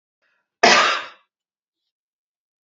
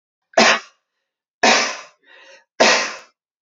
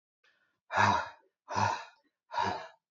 {
  "cough_length": "2.6 s",
  "cough_amplitude": 28251,
  "cough_signal_mean_std_ratio": 0.29,
  "three_cough_length": "3.4 s",
  "three_cough_amplitude": 30376,
  "three_cough_signal_mean_std_ratio": 0.39,
  "exhalation_length": "2.9 s",
  "exhalation_amplitude": 8428,
  "exhalation_signal_mean_std_ratio": 0.45,
  "survey_phase": "beta (2021-08-13 to 2022-03-07)",
  "age": "18-44",
  "gender": "Male",
  "wearing_mask": "No",
  "symptom_none": true,
  "smoker_status": "Ex-smoker",
  "respiratory_condition_asthma": false,
  "respiratory_condition_other": false,
  "recruitment_source": "Test and Trace",
  "submission_delay": "0 days",
  "covid_test_result": "Negative",
  "covid_test_method": "LFT"
}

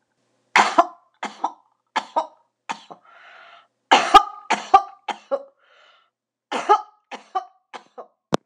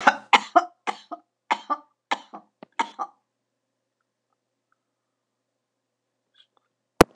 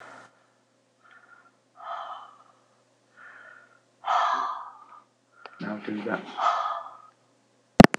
{
  "three_cough_length": "8.5 s",
  "three_cough_amplitude": 26028,
  "three_cough_signal_mean_std_ratio": 0.28,
  "cough_length": "7.2 s",
  "cough_amplitude": 26028,
  "cough_signal_mean_std_ratio": 0.18,
  "exhalation_length": "8.0 s",
  "exhalation_amplitude": 26028,
  "exhalation_signal_mean_std_ratio": 0.26,
  "survey_phase": "beta (2021-08-13 to 2022-03-07)",
  "age": "65+",
  "gender": "Female",
  "wearing_mask": "No",
  "symptom_cough_any": true,
  "symptom_fatigue": true,
  "smoker_status": "Never smoked",
  "respiratory_condition_asthma": false,
  "respiratory_condition_other": false,
  "recruitment_source": "REACT",
  "submission_delay": "2 days",
  "covid_test_result": "Negative",
  "covid_test_method": "RT-qPCR",
  "influenza_a_test_result": "Negative",
  "influenza_b_test_result": "Negative"
}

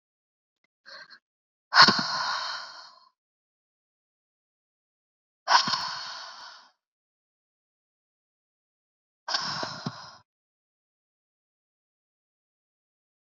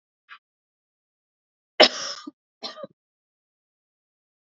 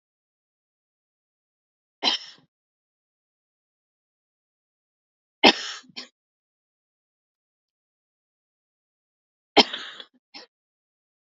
{
  "exhalation_length": "13.3 s",
  "exhalation_amplitude": 29159,
  "exhalation_signal_mean_std_ratio": 0.24,
  "cough_length": "4.4 s",
  "cough_amplitude": 31588,
  "cough_signal_mean_std_ratio": 0.16,
  "three_cough_length": "11.3 s",
  "three_cough_amplitude": 32768,
  "three_cough_signal_mean_std_ratio": 0.14,
  "survey_phase": "beta (2021-08-13 to 2022-03-07)",
  "age": "18-44",
  "gender": "Female",
  "wearing_mask": "No",
  "symptom_fatigue": true,
  "symptom_onset": "12 days",
  "smoker_status": "Never smoked",
  "respiratory_condition_asthma": false,
  "respiratory_condition_other": false,
  "recruitment_source": "REACT",
  "submission_delay": "1 day",
  "covid_test_result": "Negative",
  "covid_test_method": "RT-qPCR"
}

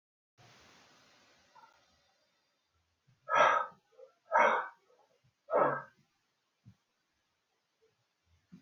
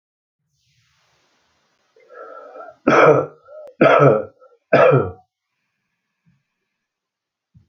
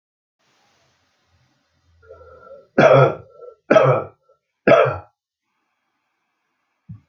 {
  "exhalation_length": "8.6 s",
  "exhalation_amplitude": 6943,
  "exhalation_signal_mean_std_ratio": 0.27,
  "cough_length": "7.7 s",
  "cough_amplitude": 30667,
  "cough_signal_mean_std_ratio": 0.33,
  "three_cough_length": "7.1 s",
  "three_cough_amplitude": 28523,
  "three_cough_signal_mean_std_ratio": 0.3,
  "survey_phase": "alpha (2021-03-01 to 2021-08-12)",
  "age": "65+",
  "gender": "Male",
  "wearing_mask": "No",
  "symptom_cough_any": true,
  "smoker_status": "Ex-smoker",
  "respiratory_condition_asthma": false,
  "respiratory_condition_other": false,
  "recruitment_source": "REACT",
  "submission_delay": "2 days",
  "covid_test_result": "Negative",
  "covid_test_method": "RT-qPCR"
}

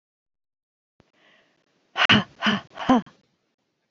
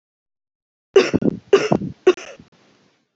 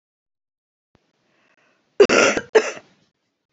{
  "exhalation_length": "3.9 s",
  "exhalation_amplitude": 24571,
  "exhalation_signal_mean_std_ratio": 0.29,
  "three_cough_length": "3.2 s",
  "three_cough_amplitude": 30750,
  "three_cough_signal_mean_std_ratio": 0.32,
  "cough_length": "3.5 s",
  "cough_amplitude": 27845,
  "cough_signal_mean_std_ratio": 0.27,
  "survey_phase": "beta (2021-08-13 to 2022-03-07)",
  "age": "45-64",
  "gender": "Female",
  "wearing_mask": "No",
  "symptom_cough_any": true,
  "symptom_fatigue": true,
  "symptom_change_to_sense_of_smell_or_taste": true,
  "symptom_onset": "5 days",
  "smoker_status": "Never smoked",
  "respiratory_condition_asthma": false,
  "respiratory_condition_other": false,
  "recruitment_source": "Test and Trace",
  "submission_delay": "2 days",
  "covid_test_result": "Positive",
  "covid_test_method": "ePCR"
}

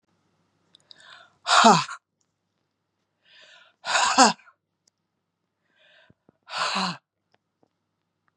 {
  "exhalation_length": "8.4 s",
  "exhalation_amplitude": 30601,
  "exhalation_signal_mean_std_ratio": 0.27,
  "survey_phase": "beta (2021-08-13 to 2022-03-07)",
  "age": "65+",
  "gender": "Female",
  "wearing_mask": "No",
  "symptom_cough_any": true,
  "symptom_runny_or_blocked_nose": true,
  "symptom_headache": true,
  "smoker_status": "Ex-smoker",
  "respiratory_condition_asthma": false,
  "respiratory_condition_other": false,
  "recruitment_source": "Test and Trace",
  "submission_delay": "1 day",
  "covid_test_result": "Positive",
  "covid_test_method": "ePCR"
}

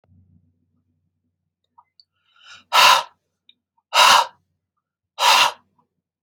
{
  "exhalation_length": "6.2 s",
  "exhalation_amplitude": 31756,
  "exhalation_signal_mean_std_ratio": 0.31,
  "survey_phase": "alpha (2021-03-01 to 2021-08-12)",
  "age": "18-44",
  "gender": "Male",
  "wearing_mask": "No",
  "symptom_none": true,
  "smoker_status": "Never smoked",
  "respiratory_condition_asthma": false,
  "respiratory_condition_other": false,
  "recruitment_source": "REACT",
  "submission_delay": "1 day",
  "covid_test_result": "Negative",
  "covid_test_method": "RT-qPCR"
}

